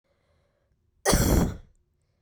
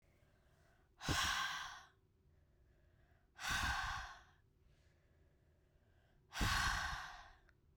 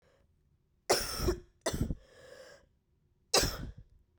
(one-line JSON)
{"cough_length": "2.2 s", "cough_amplitude": 13199, "cough_signal_mean_std_ratio": 0.38, "exhalation_length": "7.8 s", "exhalation_amplitude": 2041, "exhalation_signal_mean_std_ratio": 0.46, "three_cough_length": "4.2 s", "three_cough_amplitude": 8278, "three_cough_signal_mean_std_ratio": 0.39, "survey_phase": "beta (2021-08-13 to 2022-03-07)", "age": "18-44", "gender": "Female", "wearing_mask": "No", "symptom_cough_any": true, "symptom_runny_or_blocked_nose": true, "symptom_fatigue": true, "symptom_change_to_sense_of_smell_or_taste": true, "symptom_loss_of_taste": true, "smoker_status": "Ex-smoker", "respiratory_condition_asthma": true, "respiratory_condition_other": false, "recruitment_source": "Test and Trace", "submission_delay": "1 day", "covid_test_result": "Positive", "covid_test_method": "RT-qPCR", "covid_ct_value": 15.2, "covid_ct_gene": "ORF1ab gene", "covid_ct_mean": 16.1, "covid_viral_load": "5100000 copies/ml", "covid_viral_load_category": "High viral load (>1M copies/ml)"}